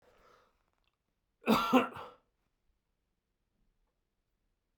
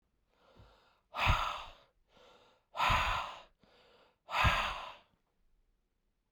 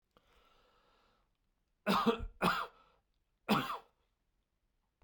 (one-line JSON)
{"cough_length": "4.8 s", "cough_amplitude": 8238, "cough_signal_mean_std_ratio": 0.23, "exhalation_length": "6.3 s", "exhalation_amplitude": 5286, "exhalation_signal_mean_std_ratio": 0.4, "three_cough_length": "5.0 s", "three_cough_amplitude": 5040, "three_cough_signal_mean_std_ratio": 0.33, "survey_phase": "beta (2021-08-13 to 2022-03-07)", "age": "45-64", "gender": "Male", "wearing_mask": "No", "symptom_none": true, "smoker_status": "Never smoked", "respiratory_condition_asthma": false, "respiratory_condition_other": false, "recruitment_source": "REACT", "submission_delay": "0 days", "covid_test_result": "Negative", "covid_test_method": "RT-qPCR", "influenza_a_test_result": "Negative", "influenza_b_test_result": "Negative"}